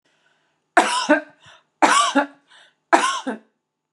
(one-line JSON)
{"three_cough_length": "3.9 s", "three_cough_amplitude": 32680, "three_cough_signal_mean_std_ratio": 0.41, "survey_phase": "beta (2021-08-13 to 2022-03-07)", "age": "45-64", "gender": "Female", "wearing_mask": "No", "symptom_none": true, "smoker_status": "Never smoked", "respiratory_condition_asthma": false, "respiratory_condition_other": false, "recruitment_source": "REACT", "submission_delay": "1 day", "covid_test_result": "Negative", "covid_test_method": "RT-qPCR", "influenza_a_test_result": "Negative", "influenza_b_test_result": "Negative"}